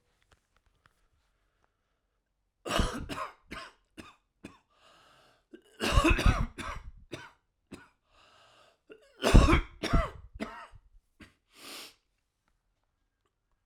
{"three_cough_length": "13.7 s", "three_cough_amplitude": 16502, "three_cough_signal_mean_std_ratio": 0.27, "survey_phase": "alpha (2021-03-01 to 2021-08-12)", "age": "45-64", "gender": "Male", "wearing_mask": "No", "symptom_cough_any": true, "symptom_change_to_sense_of_smell_or_taste": true, "symptom_loss_of_taste": true, "symptom_onset": "6 days", "smoker_status": "Ex-smoker", "respiratory_condition_asthma": true, "respiratory_condition_other": false, "recruitment_source": "Test and Trace", "submission_delay": "2 days", "covid_test_result": "Positive", "covid_test_method": "RT-qPCR", "covid_ct_value": 18.6, "covid_ct_gene": "ORF1ab gene"}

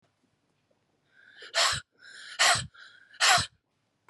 {"exhalation_length": "4.1 s", "exhalation_amplitude": 12321, "exhalation_signal_mean_std_ratio": 0.35, "survey_phase": "beta (2021-08-13 to 2022-03-07)", "age": "45-64", "gender": "Female", "wearing_mask": "No", "symptom_none": true, "smoker_status": "Ex-smoker", "respiratory_condition_asthma": false, "respiratory_condition_other": false, "recruitment_source": "REACT", "submission_delay": "1 day", "covid_test_result": "Negative", "covid_test_method": "RT-qPCR"}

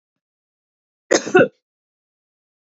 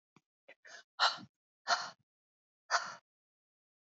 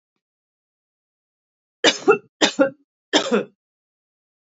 {"cough_length": "2.7 s", "cough_amplitude": 27377, "cough_signal_mean_std_ratio": 0.23, "exhalation_length": "3.9 s", "exhalation_amplitude": 5576, "exhalation_signal_mean_std_ratio": 0.27, "three_cough_length": "4.5 s", "three_cough_amplitude": 29858, "three_cough_signal_mean_std_ratio": 0.29, "survey_phase": "beta (2021-08-13 to 2022-03-07)", "age": "18-44", "gender": "Female", "wearing_mask": "No", "symptom_none": true, "symptom_onset": "4 days", "smoker_status": "Never smoked", "respiratory_condition_asthma": false, "respiratory_condition_other": false, "recruitment_source": "Test and Trace", "submission_delay": "2 days", "covid_test_result": "Positive", "covid_test_method": "RT-qPCR", "covid_ct_value": 27.8, "covid_ct_gene": "N gene"}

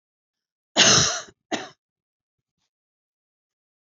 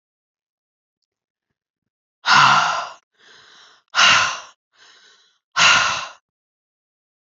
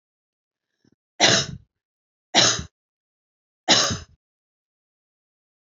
{"cough_length": "3.9 s", "cough_amplitude": 25768, "cough_signal_mean_std_ratio": 0.27, "exhalation_length": "7.3 s", "exhalation_amplitude": 29200, "exhalation_signal_mean_std_ratio": 0.35, "three_cough_length": "5.6 s", "three_cough_amplitude": 26233, "three_cough_signal_mean_std_ratio": 0.29, "survey_phase": "beta (2021-08-13 to 2022-03-07)", "age": "45-64", "gender": "Female", "wearing_mask": "No", "symptom_none": true, "smoker_status": "Never smoked", "respiratory_condition_asthma": false, "respiratory_condition_other": false, "recruitment_source": "Test and Trace", "submission_delay": "2 days", "covid_test_result": "Negative", "covid_test_method": "RT-qPCR"}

